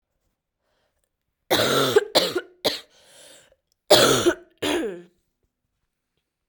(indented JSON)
{
  "cough_length": "6.5 s",
  "cough_amplitude": 32767,
  "cough_signal_mean_std_ratio": 0.38,
  "survey_phase": "beta (2021-08-13 to 2022-03-07)",
  "age": "18-44",
  "gender": "Female",
  "wearing_mask": "No",
  "symptom_cough_any": true,
  "symptom_new_continuous_cough": true,
  "symptom_runny_or_blocked_nose": true,
  "symptom_sore_throat": true,
  "symptom_fatigue": true,
  "symptom_fever_high_temperature": true,
  "symptom_headache": true,
  "symptom_change_to_sense_of_smell_or_taste": true,
  "symptom_onset": "3 days",
  "smoker_status": "Never smoked",
  "respiratory_condition_asthma": false,
  "respiratory_condition_other": false,
  "recruitment_source": "Test and Trace",
  "submission_delay": "2 days",
  "covid_test_result": "Positive",
  "covid_test_method": "RT-qPCR",
  "covid_ct_value": 13.1,
  "covid_ct_gene": "S gene",
  "covid_ct_mean": 13.8,
  "covid_viral_load": "31000000 copies/ml",
  "covid_viral_load_category": "High viral load (>1M copies/ml)"
}